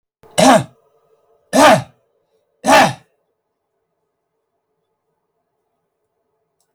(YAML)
three_cough_length: 6.7 s
three_cough_amplitude: 32768
three_cough_signal_mean_std_ratio: 0.29
survey_phase: beta (2021-08-13 to 2022-03-07)
age: 65+
gender: Male
wearing_mask: 'No'
symptom_none: true
smoker_status: Never smoked
respiratory_condition_asthma: true
respiratory_condition_other: true
recruitment_source: REACT
submission_delay: 0 days
covid_test_result: Negative
covid_test_method: RT-qPCR
influenza_a_test_result: Negative
influenza_b_test_result: Negative